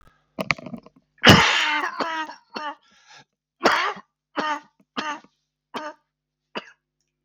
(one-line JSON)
{"cough_length": "7.2 s", "cough_amplitude": 32768, "cough_signal_mean_std_ratio": 0.34, "survey_phase": "beta (2021-08-13 to 2022-03-07)", "age": "45-64", "gender": "Male", "wearing_mask": "No", "symptom_cough_any": true, "symptom_runny_or_blocked_nose": true, "symptom_shortness_of_breath": true, "symptom_fatigue": true, "symptom_change_to_sense_of_smell_or_taste": true, "symptom_onset": "11 days", "smoker_status": "Never smoked", "respiratory_condition_asthma": false, "respiratory_condition_other": false, "recruitment_source": "REACT", "submission_delay": "2 days", "covid_test_result": "Positive", "covid_test_method": "RT-qPCR", "covid_ct_value": 24.0, "covid_ct_gene": "E gene", "influenza_a_test_result": "Negative", "influenza_b_test_result": "Negative"}